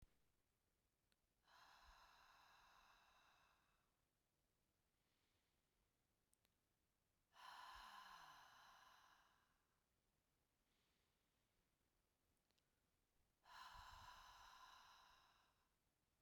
{"exhalation_length": "16.2 s", "exhalation_amplitude": 104, "exhalation_signal_mean_std_ratio": 0.54, "survey_phase": "beta (2021-08-13 to 2022-03-07)", "age": "18-44", "gender": "Female", "wearing_mask": "No", "symptom_cough_any": true, "symptom_runny_or_blocked_nose": true, "symptom_sore_throat": true, "symptom_headache": true, "symptom_onset": "2 days", "smoker_status": "Never smoked", "respiratory_condition_asthma": false, "respiratory_condition_other": false, "recruitment_source": "Test and Trace", "submission_delay": "1 day", "covid_test_result": "Positive", "covid_test_method": "RT-qPCR"}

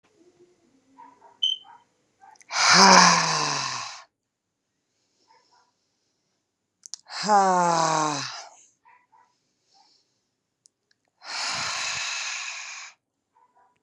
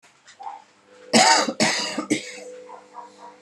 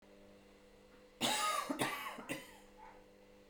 {"exhalation_length": "13.8 s", "exhalation_amplitude": 32689, "exhalation_signal_mean_std_ratio": 0.36, "cough_length": "3.4 s", "cough_amplitude": 23561, "cough_signal_mean_std_ratio": 0.45, "three_cough_length": "3.5 s", "three_cough_amplitude": 3193, "three_cough_signal_mean_std_ratio": 0.53, "survey_phase": "beta (2021-08-13 to 2022-03-07)", "age": "18-44", "gender": "Female", "wearing_mask": "No", "symptom_runny_or_blocked_nose": true, "symptom_sore_throat": true, "symptom_onset": "12 days", "smoker_status": "Current smoker (e-cigarettes or vapes only)", "respiratory_condition_asthma": false, "respiratory_condition_other": false, "recruitment_source": "REACT", "submission_delay": "3 days", "covid_test_result": "Negative", "covid_test_method": "RT-qPCR"}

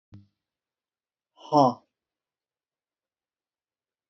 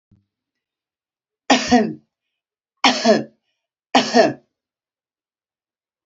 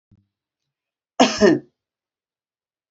{"exhalation_length": "4.1 s", "exhalation_amplitude": 14545, "exhalation_signal_mean_std_ratio": 0.18, "three_cough_length": "6.1 s", "three_cough_amplitude": 29659, "three_cough_signal_mean_std_ratio": 0.31, "cough_length": "2.9 s", "cough_amplitude": 32575, "cough_signal_mean_std_ratio": 0.26, "survey_phase": "beta (2021-08-13 to 2022-03-07)", "age": "65+", "gender": "Female", "wearing_mask": "No", "symptom_none": true, "smoker_status": "Ex-smoker", "respiratory_condition_asthma": false, "respiratory_condition_other": false, "recruitment_source": "REACT", "submission_delay": "5 days", "covid_test_result": "Negative", "covid_test_method": "RT-qPCR"}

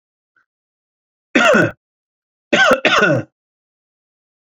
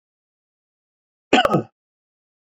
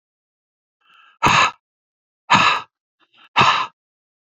{"three_cough_length": "4.5 s", "three_cough_amplitude": 31348, "three_cough_signal_mean_std_ratio": 0.38, "cough_length": "2.6 s", "cough_amplitude": 28607, "cough_signal_mean_std_ratio": 0.24, "exhalation_length": "4.4 s", "exhalation_amplitude": 28967, "exhalation_signal_mean_std_ratio": 0.36, "survey_phase": "beta (2021-08-13 to 2022-03-07)", "age": "45-64", "gender": "Male", "wearing_mask": "No", "symptom_fatigue": true, "symptom_headache": true, "smoker_status": "Never smoked", "respiratory_condition_asthma": false, "respiratory_condition_other": false, "recruitment_source": "REACT", "submission_delay": "0 days", "covid_test_result": "Negative", "covid_test_method": "RT-qPCR"}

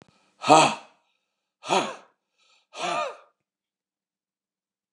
{"exhalation_length": "4.9 s", "exhalation_amplitude": 28164, "exhalation_signal_mean_std_ratio": 0.27, "survey_phase": "beta (2021-08-13 to 2022-03-07)", "age": "65+", "gender": "Male", "wearing_mask": "No", "symptom_cough_any": true, "symptom_runny_or_blocked_nose": true, "symptom_sore_throat": true, "symptom_headache": true, "smoker_status": "Ex-smoker", "respiratory_condition_asthma": false, "respiratory_condition_other": false, "recruitment_source": "REACT", "submission_delay": "2 days", "covid_test_result": "Negative", "covid_test_method": "RT-qPCR", "influenza_a_test_result": "Negative", "influenza_b_test_result": "Negative"}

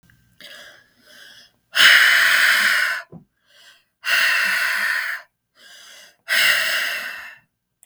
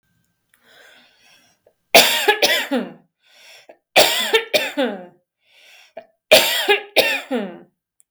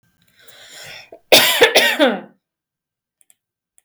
{"exhalation_length": "7.9 s", "exhalation_amplitude": 32766, "exhalation_signal_mean_std_ratio": 0.54, "three_cough_length": "8.1 s", "three_cough_amplitude": 32768, "three_cough_signal_mean_std_ratio": 0.41, "cough_length": "3.8 s", "cough_amplitude": 32768, "cough_signal_mean_std_ratio": 0.36, "survey_phase": "beta (2021-08-13 to 2022-03-07)", "age": "18-44", "gender": "Female", "wearing_mask": "No", "symptom_sore_throat": true, "symptom_fatigue": true, "symptom_headache": true, "symptom_onset": "5 days", "smoker_status": "Never smoked", "respiratory_condition_asthma": true, "respiratory_condition_other": false, "recruitment_source": "REACT", "submission_delay": "1 day", "covid_test_result": "Negative", "covid_test_method": "RT-qPCR", "influenza_a_test_result": "Negative", "influenza_b_test_result": "Negative"}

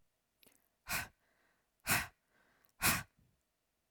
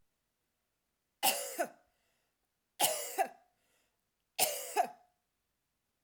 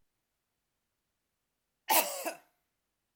{"exhalation_length": "3.9 s", "exhalation_amplitude": 4124, "exhalation_signal_mean_std_ratio": 0.29, "three_cough_length": "6.0 s", "three_cough_amplitude": 6952, "three_cough_signal_mean_std_ratio": 0.33, "cough_length": "3.2 s", "cough_amplitude": 7301, "cough_signal_mean_std_ratio": 0.24, "survey_phase": "alpha (2021-03-01 to 2021-08-12)", "age": "18-44", "gender": "Female", "wearing_mask": "No", "symptom_none": true, "smoker_status": "Never smoked", "respiratory_condition_asthma": false, "respiratory_condition_other": false, "recruitment_source": "REACT", "submission_delay": "2 days", "covid_test_result": "Negative", "covid_test_method": "RT-qPCR"}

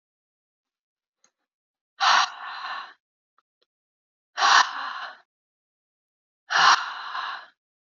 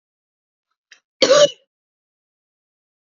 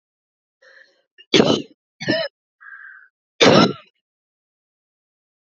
{"exhalation_length": "7.9 s", "exhalation_amplitude": 22053, "exhalation_signal_mean_std_ratio": 0.33, "cough_length": "3.1 s", "cough_amplitude": 30902, "cough_signal_mean_std_ratio": 0.23, "three_cough_length": "5.5 s", "three_cough_amplitude": 29698, "three_cough_signal_mean_std_ratio": 0.29, "survey_phase": "beta (2021-08-13 to 2022-03-07)", "age": "45-64", "gender": "Female", "wearing_mask": "No", "symptom_runny_or_blocked_nose": true, "symptom_sore_throat": true, "smoker_status": "Ex-smoker", "respiratory_condition_asthma": false, "respiratory_condition_other": false, "recruitment_source": "Test and Trace", "submission_delay": "1 day", "covid_test_result": "Positive", "covid_test_method": "RT-qPCR"}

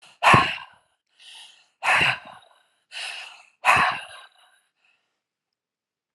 {"exhalation_length": "6.1 s", "exhalation_amplitude": 28599, "exhalation_signal_mean_std_ratio": 0.34, "survey_phase": "alpha (2021-03-01 to 2021-08-12)", "age": "65+", "gender": "Female", "wearing_mask": "No", "symptom_none": true, "smoker_status": "Ex-smoker", "respiratory_condition_asthma": false, "respiratory_condition_other": false, "recruitment_source": "REACT", "submission_delay": "3 days", "covid_test_result": "Negative", "covid_test_method": "RT-qPCR"}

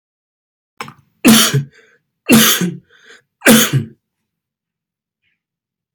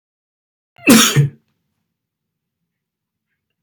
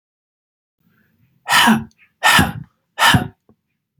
{"three_cough_length": "5.9 s", "three_cough_amplitude": 32768, "three_cough_signal_mean_std_ratio": 0.36, "cough_length": "3.6 s", "cough_amplitude": 32768, "cough_signal_mean_std_ratio": 0.27, "exhalation_length": "4.0 s", "exhalation_amplitude": 32768, "exhalation_signal_mean_std_ratio": 0.38, "survey_phase": "beta (2021-08-13 to 2022-03-07)", "age": "18-44", "gender": "Male", "wearing_mask": "No", "symptom_none": true, "smoker_status": "Never smoked", "respiratory_condition_asthma": false, "respiratory_condition_other": false, "recruitment_source": "REACT", "submission_delay": "1 day", "covid_test_result": "Negative", "covid_test_method": "RT-qPCR", "influenza_a_test_result": "Negative", "influenza_b_test_result": "Negative"}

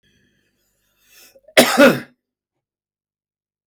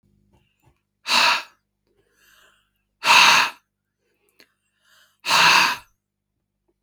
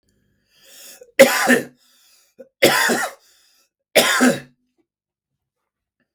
{"cough_length": "3.7 s", "cough_amplitude": 32768, "cough_signal_mean_std_ratio": 0.25, "exhalation_length": "6.8 s", "exhalation_amplitude": 31973, "exhalation_signal_mean_std_ratio": 0.34, "three_cough_length": "6.1 s", "three_cough_amplitude": 32768, "three_cough_signal_mean_std_ratio": 0.35, "survey_phase": "beta (2021-08-13 to 2022-03-07)", "age": "45-64", "gender": "Male", "wearing_mask": "No", "symptom_none": true, "smoker_status": "Never smoked", "respiratory_condition_asthma": true, "respiratory_condition_other": false, "recruitment_source": "REACT", "submission_delay": "1 day", "covid_test_result": "Negative", "covid_test_method": "RT-qPCR", "influenza_a_test_result": "Unknown/Void", "influenza_b_test_result": "Unknown/Void"}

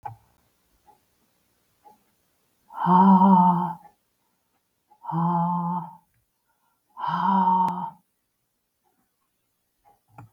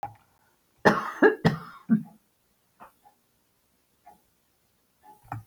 {"exhalation_length": "10.3 s", "exhalation_amplitude": 18938, "exhalation_signal_mean_std_ratio": 0.39, "cough_length": "5.5 s", "cough_amplitude": 26017, "cough_signal_mean_std_ratio": 0.26, "survey_phase": "beta (2021-08-13 to 2022-03-07)", "age": "65+", "gender": "Female", "wearing_mask": "No", "symptom_none": true, "smoker_status": "Never smoked", "respiratory_condition_asthma": false, "respiratory_condition_other": false, "recruitment_source": "REACT", "submission_delay": "1 day", "covid_test_result": "Negative", "covid_test_method": "RT-qPCR"}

